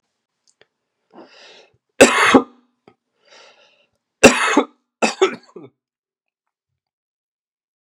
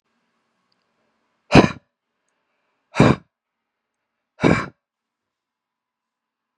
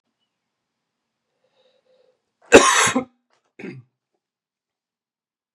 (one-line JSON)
{"three_cough_length": "7.9 s", "three_cough_amplitude": 32768, "three_cough_signal_mean_std_ratio": 0.25, "exhalation_length": "6.6 s", "exhalation_amplitude": 32768, "exhalation_signal_mean_std_ratio": 0.2, "cough_length": "5.5 s", "cough_amplitude": 32768, "cough_signal_mean_std_ratio": 0.21, "survey_phase": "beta (2021-08-13 to 2022-03-07)", "age": "18-44", "gender": "Male", "wearing_mask": "No", "symptom_cough_any": true, "symptom_runny_or_blocked_nose": true, "symptom_fatigue": true, "symptom_fever_high_temperature": true, "symptom_headache": true, "smoker_status": "Current smoker (e-cigarettes or vapes only)", "respiratory_condition_asthma": false, "respiratory_condition_other": false, "recruitment_source": "Test and Trace", "submission_delay": "1 day", "covid_test_result": "Positive", "covid_test_method": "RT-qPCR", "covid_ct_value": 26.6, "covid_ct_gene": "ORF1ab gene", "covid_ct_mean": 27.0, "covid_viral_load": "1400 copies/ml", "covid_viral_load_category": "Minimal viral load (< 10K copies/ml)"}